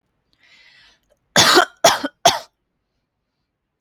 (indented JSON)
{
  "three_cough_length": "3.8 s",
  "three_cough_amplitude": 32490,
  "three_cough_signal_mean_std_ratio": 0.3,
  "survey_phase": "alpha (2021-03-01 to 2021-08-12)",
  "age": "18-44",
  "gender": "Female",
  "wearing_mask": "No",
  "symptom_none": true,
  "smoker_status": "Never smoked",
  "respiratory_condition_asthma": true,
  "respiratory_condition_other": false,
  "recruitment_source": "REACT",
  "submission_delay": "2 days",
  "covid_test_result": "Negative",
  "covid_test_method": "RT-qPCR"
}